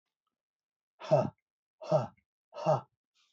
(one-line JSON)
{"exhalation_length": "3.3 s", "exhalation_amplitude": 7310, "exhalation_signal_mean_std_ratio": 0.32, "survey_phase": "beta (2021-08-13 to 2022-03-07)", "age": "45-64", "gender": "Male", "wearing_mask": "No", "symptom_none": true, "smoker_status": "Never smoked", "respiratory_condition_asthma": false, "respiratory_condition_other": false, "recruitment_source": "REACT", "submission_delay": "1 day", "covid_test_result": "Negative", "covid_test_method": "RT-qPCR"}